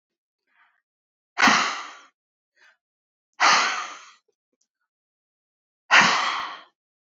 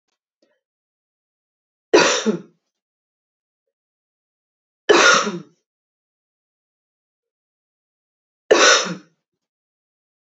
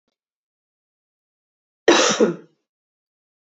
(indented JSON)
{
  "exhalation_length": "7.2 s",
  "exhalation_amplitude": 26227,
  "exhalation_signal_mean_std_ratio": 0.33,
  "three_cough_length": "10.3 s",
  "three_cough_amplitude": 29259,
  "three_cough_signal_mean_std_ratio": 0.26,
  "cough_length": "3.6 s",
  "cough_amplitude": 27275,
  "cough_signal_mean_std_ratio": 0.27,
  "survey_phase": "beta (2021-08-13 to 2022-03-07)",
  "age": "18-44",
  "gender": "Female",
  "wearing_mask": "No",
  "symptom_fatigue": true,
  "symptom_headache": true,
  "symptom_change_to_sense_of_smell_or_taste": true,
  "symptom_loss_of_taste": true,
  "symptom_onset": "2 days",
  "smoker_status": "Ex-smoker",
  "respiratory_condition_asthma": false,
  "respiratory_condition_other": false,
  "recruitment_source": "Test and Trace",
  "submission_delay": "2 days",
  "covid_test_result": "Positive",
  "covid_test_method": "RT-qPCR",
  "covid_ct_value": 17.6,
  "covid_ct_gene": "ORF1ab gene"
}